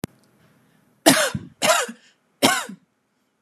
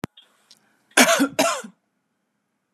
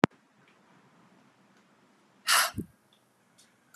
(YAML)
three_cough_length: 3.4 s
three_cough_amplitude: 32767
three_cough_signal_mean_std_ratio: 0.36
cough_length: 2.7 s
cough_amplitude: 32715
cough_signal_mean_std_ratio: 0.34
exhalation_length: 3.8 s
exhalation_amplitude: 25498
exhalation_signal_mean_std_ratio: 0.22
survey_phase: beta (2021-08-13 to 2022-03-07)
age: 18-44
gender: Female
wearing_mask: 'No'
symptom_none: true
smoker_status: Ex-smoker
respiratory_condition_asthma: false
respiratory_condition_other: false
recruitment_source: REACT
submission_delay: 2 days
covid_test_result: Negative
covid_test_method: RT-qPCR